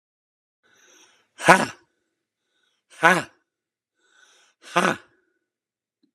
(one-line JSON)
{"exhalation_length": "6.1 s", "exhalation_amplitude": 32768, "exhalation_signal_mean_std_ratio": 0.21, "survey_phase": "alpha (2021-03-01 to 2021-08-12)", "age": "45-64", "gender": "Male", "wearing_mask": "No", "symptom_none": true, "smoker_status": "Never smoked", "respiratory_condition_asthma": true, "respiratory_condition_other": false, "recruitment_source": "REACT", "submission_delay": "3 days", "covid_test_result": "Negative", "covid_test_method": "RT-qPCR"}